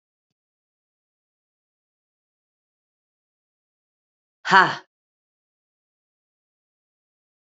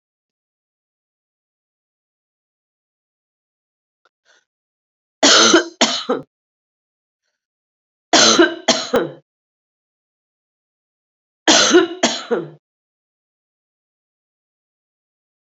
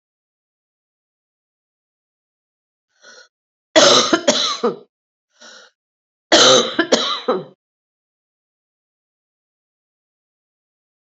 {
  "exhalation_length": "7.6 s",
  "exhalation_amplitude": 28003,
  "exhalation_signal_mean_std_ratio": 0.12,
  "three_cough_length": "15.5 s",
  "three_cough_amplitude": 31819,
  "three_cough_signal_mean_std_ratio": 0.28,
  "cough_length": "11.2 s",
  "cough_amplitude": 31506,
  "cough_signal_mean_std_ratio": 0.29,
  "survey_phase": "beta (2021-08-13 to 2022-03-07)",
  "age": "45-64",
  "gender": "Female",
  "wearing_mask": "No",
  "symptom_cough_any": true,
  "symptom_runny_or_blocked_nose": true,
  "symptom_sore_throat": true,
  "symptom_fatigue": true,
  "symptom_headache": true,
  "symptom_onset": "2 days",
  "smoker_status": "Current smoker (e-cigarettes or vapes only)",
  "respiratory_condition_asthma": false,
  "respiratory_condition_other": false,
  "recruitment_source": "Test and Trace",
  "submission_delay": "2 days",
  "covid_test_result": "Positive",
  "covid_test_method": "RT-qPCR",
  "covid_ct_value": 17.2,
  "covid_ct_gene": "ORF1ab gene",
  "covid_ct_mean": 17.4,
  "covid_viral_load": "2000000 copies/ml",
  "covid_viral_load_category": "High viral load (>1M copies/ml)"
}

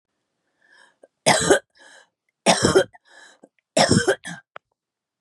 {
  "three_cough_length": "5.2 s",
  "three_cough_amplitude": 29586,
  "three_cough_signal_mean_std_ratio": 0.35,
  "survey_phase": "beta (2021-08-13 to 2022-03-07)",
  "age": "45-64",
  "gender": "Female",
  "wearing_mask": "No",
  "symptom_runny_or_blocked_nose": true,
  "symptom_shortness_of_breath": true,
  "symptom_change_to_sense_of_smell_or_taste": true,
  "smoker_status": "Ex-smoker",
  "respiratory_condition_asthma": false,
  "respiratory_condition_other": false,
  "recruitment_source": "REACT",
  "submission_delay": "2 days",
  "covid_test_result": "Negative",
  "covid_test_method": "RT-qPCR",
  "influenza_a_test_result": "Negative",
  "influenza_b_test_result": "Negative"
}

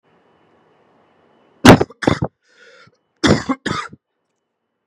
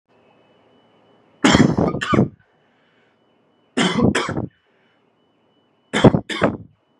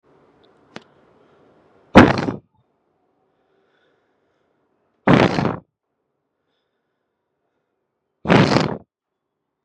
{
  "cough_length": "4.9 s",
  "cough_amplitude": 32768,
  "cough_signal_mean_std_ratio": 0.26,
  "three_cough_length": "7.0 s",
  "three_cough_amplitude": 32768,
  "three_cough_signal_mean_std_ratio": 0.37,
  "exhalation_length": "9.6 s",
  "exhalation_amplitude": 32768,
  "exhalation_signal_mean_std_ratio": 0.25,
  "survey_phase": "beta (2021-08-13 to 2022-03-07)",
  "age": "18-44",
  "gender": "Male",
  "wearing_mask": "No",
  "symptom_cough_any": true,
  "symptom_runny_or_blocked_nose": true,
  "symptom_onset": "4 days",
  "smoker_status": "Never smoked",
  "respiratory_condition_asthma": false,
  "respiratory_condition_other": false,
  "recruitment_source": "Test and Trace",
  "submission_delay": "2 days",
  "covid_test_result": "Positive",
  "covid_test_method": "ePCR"
}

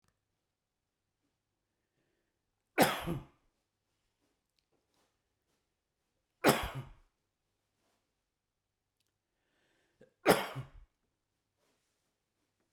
{
  "three_cough_length": "12.7 s",
  "three_cough_amplitude": 10054,
  "three_cough_signal_mean_std_ratio": 0.18,
  "survey_phase": "beta (2021-08-13 to 2022-03-07)",
  "age": "65+",
  "gender": "Male",
  "wearing_mask": "No",
  "symptom_none": true,
  "smoker_status": "Ex-smoker",
  "respiratory_condition_asthma": false,
  "respiratory_condition_other": false,
  "recruitment_source": "REACT",
  "submission_delay": "2 days",
  "covid_test_result": "Negative",
  "covid_test_method": "RT-qPCR"
}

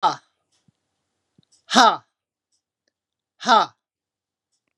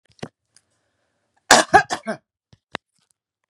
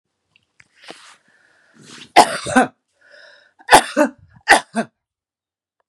{
  "exhalation_length": "4.8 s",
  "exhalation_amplitude": 32767,
  "exhalation_signal_mean_std_ratio": 0.24,
  "cough_length": "3.5 s",
  "cough_amplitude": 32768,
  "cough_signal_mean_std_ratio": 0.22,
  "three_cough_length": "5.9 s",
  "three_cough_amplitude": 32768,
  "three_cough_signal_mean_std_ratio": 0.27,
  "survey_phase": "beta (2021-08-13 to 2022-03-07)",
  "age": "65+",
  "gender": "Female",
  "wearing_mask": "No",
  "symptom_none": true,
  "smoker_status": "Never smoked",
  "respiratory_condition_asthma": false,
  "respiratory_condition_other": false,
  "recruitment_source": "REACT",
  "submission_delay": "2 days",
  "covid_test_result": "Negative",
  "covid_test_method": "RT-qPCR",
  "influenza_a_test_result": "Negative",
  "influenza_b_test_result": "Negative"
}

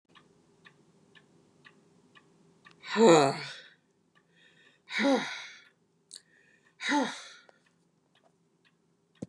{
  "exhalation_length": "9.3 s",
  "exhalation_amplitude": 16253,
  "exhalation_signal_mean_std_ratio": 0.27,
  "survey_phase": "beta (2021-08-13 to 2022-03-07)",
  "age": "65+",
  "gender": "Female",
  "wearing_mask": "No",
  "symptom_none": true,
  "smoker_status": "Never smoked",
  "respiratory_condition_asthma": false,
  "respiratory_condition_other": false,
  "recruitment_source": "REACT",
  "submission_delay": "2 days",
  "covid_test_result": "Negative",
  "covid_test_method": "RT-qPCR",
  "influenza_a_test_result": "Negative",
  "influenza_b_test_result": "Negative"
}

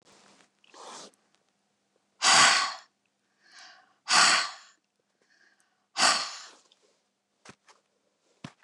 {
  "exhalation_length": "8.6 s",
  "exhalation_amplitude": 15975,
  "exhalation_signal_mean_std_ratio": 0.3,
  "survey_phase": "beta (2021-08-13 to 2022-03-07)",
  "age": "65+",
  "gender": "Female",
  "wearing_mask": "No",
  "symptom_none": true,
  "smoker_status": "Never smoked",
  "respiratory_condition_asthma": false,
  "respiratory_condition_other": false,
  "recruitment_source": "REACT",
  "submission_delay": "1 day",
  "covid_test_result": "Negative",
  "covid_test_method": "RT-qPCR",
  "influenza_a_test_result": "Negative",
  "influenza_b_test_result": "Negative"
}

